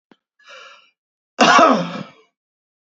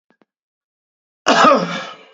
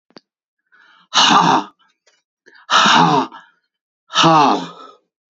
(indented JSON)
{
  "cough_length": "2.8 s",
  "cough_amplitude": 29901,
  "cough_signal_mean_std_ratio": 0.35,
  "three_cough_length": "2.1 s",
  "three_cough_amplitude": 31697,
  "three_cough_signal_mean_std_ratio": 0.39,
  "exhalation_length": "5.3 s",
  "exhalation_amplitude": 32518,
  "exhalation_signal_mean_std_ratio": 0.47,
  "survey_phase": "beta (2021-08-13 to 2022-03-07)",
  "age": "45-64",
  "gender": "Male",
  "wearing_mask": "No",
  "symptom_none": true,
  "smoker_status": "Ex-smoker",
  "respiratory_condition_asthma": false,
  "respiratory_condition_other": false,
  "recruitment_source": "REACT",
  "submission_delay": "2 days",
  "covid_test_result": "Negative",
  "covid_test_method": "RT-qPCR",
  "influenza_a_test_result": "Negative",
  "influenza_b_test_result": "Negative"
}